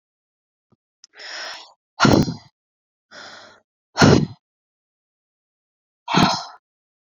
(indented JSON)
{
  "exhalation_length": "7.1 s",
  "exhalation_amplitude": 27658,
  "exhalation_signal_mean_std_ratio": 0.29,
  "survey_phase": "beta (2021-08-13 to 2022-03-07)",
  "age": "18-44",
  "gender": "Female",
  "wearing_mask": "No",
  "symptom_cough_any": true,
  "symptom_loss_of_taste": true,
  "symptom_onset": "12 days",
  "smoker_status": "Never smoked",
  "respiratory_condition_asthma": false,
  "respiratory_condition_other": false,
  "recruitment_source": "REACT",
  "submission_delay": "1 day",
  "covid_test_result": "Negative",
  "covid_test_method": "RT-qPCR"
}